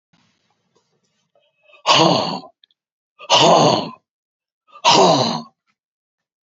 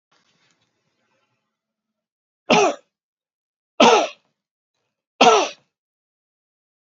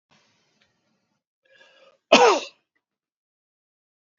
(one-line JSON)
{"exhalation_length": "6.5 s", "exhalation_amplitude": 31180, "exhalation_signal_mean_std_ratio": 0.4, "three_cough_length": "6.9 s", "three_cough_amplitude": 29957, "three_cough_signal_mean_std_ratio": 0.26, "cough_length": "4.2 s", "cough_amplitude": 27880, "cough_signal_mean_std_ratio": 0.2, "survey_phase": "beta (2021-08-13 to 2022-03-07)", "age": "65+", "gender": "Male", "wearing_mask": "No", "symptom_none": true, "smoker_status": "Never smoked", "respiratory_condition_asthma": false, "respiratory_condition_other": false, "recruitment_source": "REACT", "submission_delay": "2 days", "covid_test_result": "Negative", "covid_test_method": "RT-qPCR", "influenza_a_test_result": "Negative", "influenza_b_test_result": "Negative"}